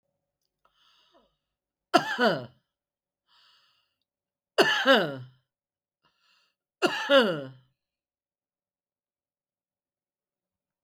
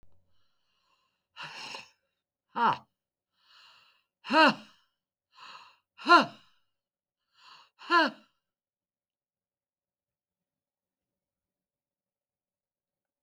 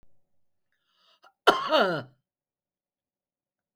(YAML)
three_cough_length: 10.8 s
three_cough_amplitude: 18896
three_cough_signal_mean_std_ratio: 0.27
exhalation_length: 13.2 s
exhalation_amplitude: 14720
exhalation_signal_mean_std_ratio: 0.21
cough_length: 3.8 s
cough_amplitude: 24681
cough_signal_mean_std_ratio: 0.26
survey_phase: beta (2021-08-13 to 2022-03-07)
age: 65+
gender: Female
wearing_mask: 'No'
symptom_none: true
smoker_status: Ex-smoker
respiratory_condition_asthma: false
respiratory_condition_other: false
recruitment_source: REACT
submission_delay: 0 days
covid_test_result: Negative
covid_test_method: RT-qPCR
influenza_a_test_result: Negative
influenza_b_test_result: Negative